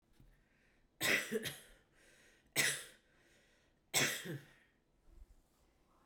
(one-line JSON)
{"three_cough_length": "6.1 s", "three_cough_amplitude": 4866, "three_cough_signal_mean_std_ratio": 0.36, "survey_phase": "beta (2021-08-13 to 2022-03-07)", "age": "18-44", "gender": "Female", "wearing_mask": "No", "symptom_cough_any": true, "symptom_runny_or_blocked_nose": true, "symptom_sore_throat": true, "symptom_headache": true, "symptom_onset": "4 days", "smoker_status": "Ex-smoker", "respiratory_condition_asthma": false, "respiratory_condition_other": false, "recruitment_source": "Test and Trace", "submission_delay": "2 days", "covid_test_result": "Positive", "covid_test_method": "RT-qPCR", "covid_ct_value": 20.5, "covid_ct_gene": "N gene"}